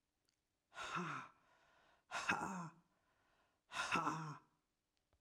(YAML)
exhalation_length: 5.2 s
exhalation_amplitude: 2113
exhalation_signal_mean_std_ratio: 0.45
survey_phase: alpha (2021-03-01 to 2021-08-12)
age: 45-64
gender: Female
wearing_mask: 'No'
symptom_none: true
smoker_status: Never smoked
respiratory_condition_asthma: false
respiratory_condition_other: false
recruitment_source: REACT
submission_delay: 2 days
covid_test_result: Negative
covid_test_method: RT-qPCR